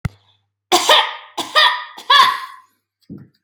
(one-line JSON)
{"three_cough_length": "3.4 s", "three_cough_amplitude": 32767, "three_cough_signal_mean_std_ratio": 0.45, "survey_phase": "beta (2021-08-13 to 2022-03-07)", "age": "18-44", "gender": "Female", "wearing_mask": "No", "symptom_none": true, "smoker_status": "Never smoked", "respiratory_condition_asthma": false, "respiratory_condition_other": false, "recruitment_source": "REACT", "submission_delay": "3 days", "covid_test_result": "Negative", "covid_test_method": "RT-qPCR", "influenza_a_test_result": "Unknown/Void", "influenza_b_test_result": "Unknown/Void"}